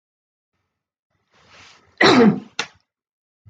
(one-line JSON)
{"cough_length": "3.5 s", "cough_amplitude": 28179, "cough_signal_mean_std_ratio": 0.28, "survey_phase": "beta (2021-08-13 to 2022-03-07)", "age": "45-64", "gender": "Female", "wearing_mask": "No", "symptom_none": true, "smoker_status": "Never smoked", "respiratory_condition_asthma": false, "respiratory_condition_other": false, "recruitment_source": "REACT", "submission_delay": "2 days", "covid_test_result": "Negative", "covid_test_method": "RT-qPCR"}